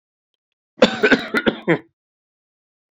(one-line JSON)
{"cough_length": "2.9 s", "cough_amplitude": 29320, "cough_signal_mean_std_ratio": 0.33, "survey_phase": "beta (2021-08-13 to 2022-03-07)", "age": "45-64", "gender": "Male", "wearing_mask": "No", "symptom_fatigue": true, "symptom_headache": true, "symptom_onset": "3 days", "smoker_status": "Never smoked", "respiratory_condition_asthma": false, "respiratory_condition_other": false, "recruitment_source": "Test and Trace", "submission_delay": "2 days", "covid_test_result": "Positive", "covid_test_method": "LAMP"}